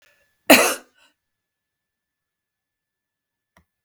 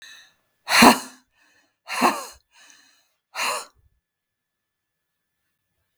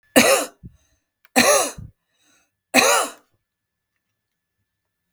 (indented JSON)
{
  "cough_length": "3.8 s",
  "cough_amplitude": 32768,
  "cough_signal_mean_std_ratio": 0.18,
  "exhalation_length": "6.0 s",
  "exhalation_amplitude": 32766,
  "exhalation_signal_mean_std_ratio": 0.25,
  "three_cough_length": "5.1 s",
  "three_cough_amplitude": 32768,
  "three_cough_signal_mean_std_ratio": 0.35,
  "survey_phase": "beta (2021-08-13 to 2022-03-07)",
  "age": "65+",
  "gender": "Female",
  "wearing_mask": "No",
  "symptom_none": true,
  "smoker_status": "Never smoked",
  "respiratory_condition_asthma": false,
  "respiratory_condition_other": false,
  "recruitment_source": "REACT",
  "submission_delay": "14 days",
  "covid_test_result": "Negative",
  "covid_test_method": "RT-qPCR",
  "influenza_a_test_result": "Negative",
  "influenza_b_test_result": "Negative"
}